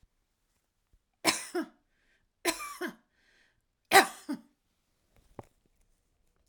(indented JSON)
{
  "three_cough_length": "6.5 s",
  "three_cough_amplitude": 20369,
  "three_cough_signal_mean_std_ratio": 0.21,
  "survey_phase": "alpha (2021-03-01 to 2021-08-12)",
  "age": "65+",
  "gender": "Female",
  "wearing_mask": "No",
  "symptom_none": true,
  "smoker_status": "Current smoker (1 to 10 cigarettes per day)",
  "respiratory_condition_asthma": false,
  "respiratory_condition_other": false,
  "recruitment_source": "REACT",
  "submission_delay": "2 days",
  "covid_test_result": "Negative",
  "covid_test_method": "RT-qPCR"
}